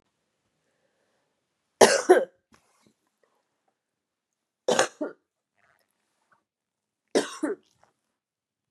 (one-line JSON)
{"three_cough_length": "8.7 s", "three_cough_amplitude": 29466, "three_cough_signal_mean_std_ratio": 0.21, "survey_phase": "beta (2021-08-13 to 2022-03-07)", "age": "45-64", "gender": "Female", "wearing_mask": "No", "symptom_cough_any": true, "symptom_runny_or_blocked_nose": true, "symptom_shortness_of_breath": true, "symptom_sore_throat": true, "symptom_abdominal_pain": true, "symptom_diarrhoea": true, "symptom_fatigue": true, "symptom_fever_high_temperature": true, "symptom_headache": true, "symptom_change_to_sense_of_smell_or_taste": true, "symptom_loss_of_taste": true, "smoker_status": "Ex-smoker", "respiratory_condition_asthma": true, "respiratory_condition_other": false, "recruitment_source": "Test and Trace", "submission_delay": "3 days", "covid_test_result": "Positive", "covid_test_method": "ePCR"}